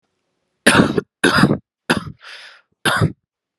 {"cough_length": "3.6 s", "cough_amplitude": 32768, "cough_signal_mean_std_ratio": 0.42, "survey_phase": "alpha (2021-03-01 to 2021-08-12)", "age": "18-44", "gender": "Male", "wearing_mask": "No", "symptom_fatigue": true, "symptom_headache": true, "smoker_status": "Current smoker (e-cigarettes or vapes only)", "respiratory_condition_asthma": false, "respiratory_condition_other": false, "recruitment_source": "Test and Trace", "submission_delay": "2 days", "covid_test_result": "Positive", "covid_test_method": "RT-qPCR", "covid_ct_value": 17.7, "covid_ct_gene": "ORF1ab gene"}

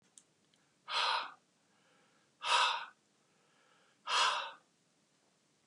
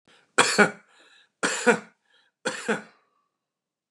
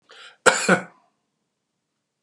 {"exhalation_length": "5.7 s", "exhalation_amplitude": 4614, "exhalation_signal_mean_std_ratio": 0.37, "three_cough_length": "3.9 s", "three_cough_amplitude": 29382, "three_cough_signal_mean_std_ratio": 0.32, "cough_length": "2.2 s", "cough_amplitude": 32768, "cough_signal_mean_std_ratio": 0.27, "survey_phase": "beta (2021-08-13 to 2022-03-07)", "age": "65+", "gender": "Male", "wearing_mask": "No", "symptom_none": true, "smoker_status": "Ex-smoker", "respiratory_condition_asthma": false, "respiratory_condition_other": false, "recruitment_source": "REACT", "submission_delay": "2 days", "covid_test_result": "Negative", "covid_test_method": "RT-qPCR", "influenza_a_test_result": "Negative", "influenza_b_test_result": "Negative"}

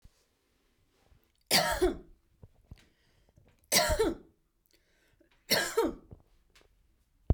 {"three_cough_length": "7.3 s", "three_cough_amplitude": 9110, "three_cough_signal_mean_std_ratio": 0.34, "survey_phase": "beta (2021-08-13 to 2022-03-07)", "age": "18-44", "gender": "Female", "wearing_mask": "No", "symptom_runny_or_blocked_nose": true, "smoker_status": "Never smoked", "respiratory_condition_asthma": false, "respiratory_condition_other": false, "recruitment_source": "Test and Trace", "submission_delay": "2 days", "covid_test_result": "Negative", "covid_test_method": "RT-qPCR"}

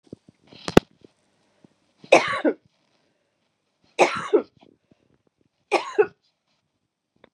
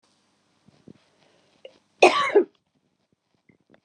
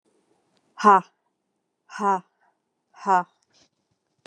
{"three_cough_length": "7.3 s", "three_cough_amplitude": 32768, "three_cough_signal_mean_std_ratio": 0.23, "cough_length": "3.8 s", "cough_amplitude": 28695, "cough_signal_mean_std_ratio": 0.23, "exhalation_length": "4.3 s", "exhalation_amplitude": 24543, "exhalation_signal_mean_std_ratio": 0.25, "survey_phase": "beta (2021-08-13 to 2022-03-07)", "age": "45-64", "gender": "Female", "wearing_mask": "No", "symptom_sore_throat": true, "symptom_diarrhoea": true, "symptom_fatigue": true, "symptom_headache": true, "smoker_status": "Prefer not to say", "respiratory_condition_asthma": false, "respiratory_condition_other": false, "recruitment_source": "Test and Trace", "submission_delay": "2 days", "covid_test_result": "Positive", "covid_test_method": "RT-qPCR", "covid_ct_value": 19.4, "covid_ct_gene": "ORF1ab gene", "covid_ct_mean": 19.5, "covid_viral_load": "400000 copies/ml", "covid_viral_load_category": "Low viral load (10K-1M copies/ml)"}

